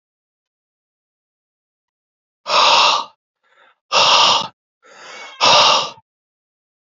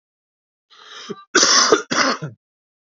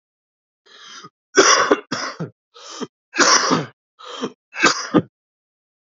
{"exhalation_length": "6.8 s", "exhalation_amplitude": 32767, "exhalation_signal_mean_std_ratio": 0.4, "cough_length": "3.0 s", "cough_amplitude": 32767, "cough_signal_mean_std_ratio": 0.42, "three_cough_length": "5.9 s", "three_cough_amplitude": 32767, "three_cough_signal_mean_std_ratio": 0.4, "survey_phase": "beta (2021-08-13 to 2022-03-07)", "age": "18-44", "gender": "Male", "wearing_mask": "No", "symptom_cough_any": true, "symptom_sore_throat": true, "symptom_fever_high_temperature": true, "symptom_headache": true, "symptom_change_to_sense_of_smell_or_taste": true, "symptom_onset": "2 days", "smoker_status": "Never smoked", "respiratory_condition_asthma": false, "respiratory_condition_other": false, "recruitment_source": "Test and Trace", "submission_delay": "2 days", "covid_test_result": "Positive", "covid_test_method": "RT-qPCR", "covid_ct_value": 12.3, "covid_ct_gene": "ORF1ab gene", "covid_ct_mean": 13.4, "covid_viral_load": "39000000 copies/ml", "covid_viral_load_category": "High viral load (>1M copies/ml)"}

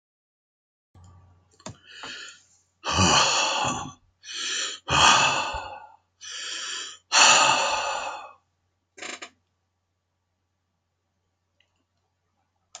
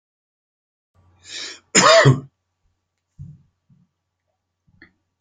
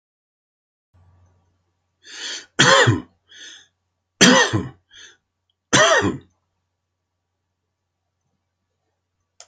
{"exhalation_length": "12.8 s", "exhalation_amplitude": 22801, "exhalation_signal_mean_std_ratio": 0.41, "cough_length": "5.2 s", "cough_amplitude": 30535, "cough_signal_mean_std_ratio": 0.25, "three_cough_length": "9.5 s", "three_cough_amplitude": 32768, "three_cough_signal_mean_std_ratio": 0.3, "survey_phase": "beta (2021-08-13 to 2022-03-07)", "age": "65+", "gender": "Male", "wearing_mask": "No", "symptom_none": true, "smoker_status": "Ex-smoker", "respiratory_condition_asthma": false, "respiratory_condition_other": false, "recruitment_source": "REACT", "submission_delay": "2 days", "covid_test_result": "Negative", "covid_test_method": "RT-qPCR", "influenza_a_test_result": "Negative", "influenza_b_test_result": "Positive", "influenza_b_ct_value": 16.3}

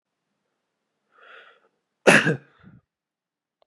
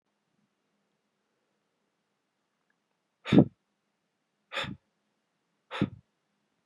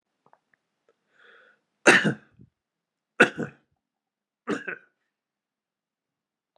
{"cough_length": "3.7 s", "cough_amplitude": 32421, "cough_signal_mean_std_ratio": 0.21, "exhalation_length": "6.7 s", "exhalation_amplitude": 18770, "exhalation_signal_mean_std_ratio": 0.16, "three_cough_length": "6.6 s", "three_cough_amplitude": 24737, "three_cough_signal_mean_std_ratio": 0.2, "survey_phase": "beta (2021-08-13 to 2022-03-07)", "age": "18-44", "gender": "Male", "wearing_mask": "No", "symptom_cough_any": true, "symptom_runny_or_blocked_nose": true, "smoker_status": "Ex-smoker", "respiratory_condition_asthma": false, "respiratory_condition_other": false, "recruitment_source": "REACT", "submission_delay": "1 day", "covid_test_result": "Negative", "covid_test_method": "RT-qPCR", "influenza_a_test_result": "Negative", "influenza_b_test_result": "Negative"}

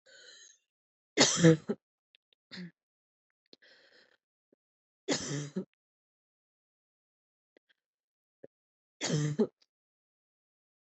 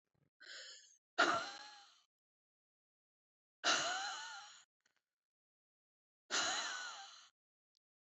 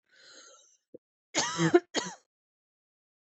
{"three_cough_length": "10.8 s", "three_cough_amplitude": 13360, "three_cough_signal_mean_std_ratio": 0.23, "exhalation_length": "8.2 s", "exhalation_amplitude": 3650, "exhalation_signal_mean_std_ratio": 0.36, "cough_length": "3.3 s", "cough_amplitude": 11583, "cough_signal_mean_std_ratio": 0.28, "survey_phase": "beta (2021-08-13 to 2022-03-07)", "age": "18-44", "gender": "Female", "wearing_mask": "No", "symptom_fatigue": true, "smoker_status": "Ex-smoker", "respiratory_condition_asthma": false, "respiratory_condition_other": false, "recruitment_source": "REACT", "submission_delay": "1 day", "covid_test_result": "Negative", "covid_test_method": "RT-qPCR", "influenza_a_test_result": "Negative", "influenza_b_test_result": "Negative"}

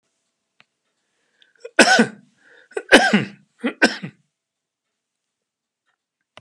{"three_cough_length": "6.4 s", "three_cough_amplitude": 32768, "three_cough_signal_mean_std_ratio": 0.26, "survey_phase": "beta (2021-08-13 to 2022-03-07)", "age": "65+", "gender": "Male", "wearing_mask": "No", "symptom_none": true, "smoker_status": "Ex-smoker", "respiratory_condition_asthma": false, "respiratory_condition_other": false, "recruitment_source": "REACT", "submission_delay": "2 days", "covid_test_result": "Negative", "covid_test_method": "RT-qPCR", "influenza_a_test_result": "Negative", "influenza_b_test_result": "Negative"}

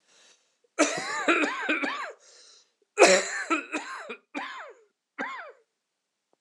{"cough_length": "6.4 s", "cough_amplitude": 23222, "cough_signal_mean_std_ratio": 0.41, "survey_phase": "beta (2021-08-13 to 2022-03-07)", "age": "45-64", "gender": "Male", "wearing_mask": "No", "symptom_cough_any": true, "symptom_runny_or_blocked_nose": true, "symptom_shortness_of_breath": true, "symptom_sore_throat": true, "symptom_fatigue": true, "symptom_change_to_sense_of_smell_or_taste": true, "symptom_onset": "3 days", "smoker_status": "Ex-smoker", "respiratory_condition_asthma": false, "respiratory_condition_other": false, "recruitment_source": "Test and Trace", "submission_delay": "2 days", "covid_test_result": "Positive", "covid_test_method": "RT-qPCR", "covid_ct_value": 22.1, "covid_ct_gene": "ORF1ab gene"}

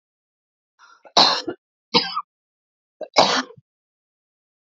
{"three_cough_length": "4.8 s", "three_cough_amplitude": 32308, "three_cough_signal_mean_std_ratio": 0.29, "survey_phase": "alpha (2021-03-01 to 2021-08-12)", "age": "45-64", "gender": "Female", "wearing_mask": "No", "symptom_none": true, "smoker_status": "Never smoked", "respiratory_condition_asthma": false, "respiratory_condition_other": false, "recruitment_source": "REACT", "submission_delay": "1 day", "covid_test_result": "Negative", "covid_test_method": "RT-qPCR"}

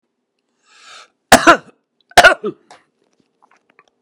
{"cough_length": "4.0 s", "cough_amplitude": 32768, "cough_signal_mean_std_ratio": 0.25, "survey_phase": "beta (2021-08-13 to 2022-03-07)", "age": "65+", "gender": "Male", "wearing_mask": "No", "symptom_cough_any": true, "symptom_runny_or_blocked_nose": true, "symptom_shortness_of_breath": true, "symptom_fatigue": true, "symptom_change_to_sense_of_smell_or_taste": true, "smoker_status": "Ex-smoker", "respiratory_condition_asthma": false, "respiratory_condition_other": false, "recruitment_source": "REACT", "submission_delay": "5 days", "covid_test_result": "Negative", "covid_test_method": "RT-qPCR"}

